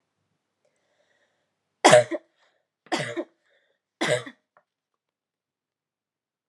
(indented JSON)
{
  "three_cough_length": "6.5 s",
  "three_cough_amplitude": 27390,
  "three_cough_signal_mean_std_ratio": 0.21,
  "survey_phase": "alpha (2021-03-01 to 2021-08-12)",
  "age": "18-44",
  "gender": "Female",
  "wearing_mask": "No",
  "symptom_headache": true,
  "symptom_change_to_sense_of_smell_or_taste": true,
  "symptom_loss_of_taste": true,
  "symptom_onset": "2 days",
  "smoker_status": "Never smoked",
  "respiratory_condition_asthma": false,
  "respiratory_condition_other": false,
  "recruitment_source": "Test and Trace",
  "submission_delay": "1 day",
  "covid_test_result": "Positive",
  "covid_test_method": "RT-qPCR",
  "covid_ct_value": 16.1,
  "covid_ct_gene": "N gene",
  "covid_ct_mean": 16.9,
  "covid_viral_load": "2800000 copies/ml",
  "covid_viral_load_category": "High viral load (>1M copies/ml)"
}